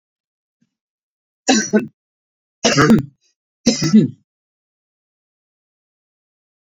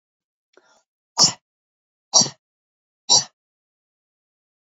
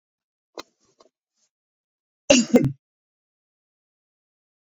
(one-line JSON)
{"three_cough_length": "6.7 s", "three_cough_amplitude": 31962, "three_cough_signal_mean_std_ratio": 0.31, "exhalation_length": "4.6 s", "exhalation_amplitude": 27955, "exhalation_signal_mean_std_ratio": 0.22, "cough_length": "4.8 s", "cough_amplitude": 27787, "cough_signal_mean_std_ratio": 0.2, "survey_phase": "beta (2021-08-13 to 2022-03-07)", "age": "65+", "gender": "Male", "wearing_mask": "No", "symptom_none": true, "smoker_status": "Ex-smoker", "respiratory_condition_asthma": false, "respiratory_condition_other": false, "recruitment_source": "REACT", "submission_delay": "1 day", "covid_test_result": "Negative", "covid_test_method": "RT-qPCR"}